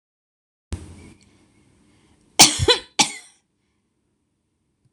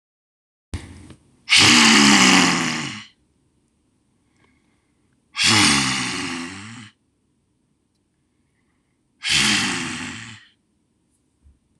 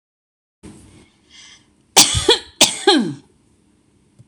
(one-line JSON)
{"cough_length": "4.9 s", "cough_amplitude": 26028, "cough_signal_mean_std_ratio": 0.22, "exhalation_length": "11.8 s", "exhalation_amplitude": 26028, "exhalation_signal_mean_std_ratio": 0.41, "three_cough_length": "4.3 s", "three_cough_amplitude": 26028, "three_cough_signal_mean_std_ratio": 0.33, "survey_phase": "beta (2021-08-13 to 2022-03-07)", "age": "45-64", "gender": "Female", "wearing_mask": "No", "symptom_none": true, "smoker_status": "Ex-smoker", "respiratory_condition_asthma": false, "respiratory_condition_other": false, "recruitment_source": "REACT", "submission_delay": "0 days", "covid_test_result": "Negative", "covid_test_method": "RT-qPCR"}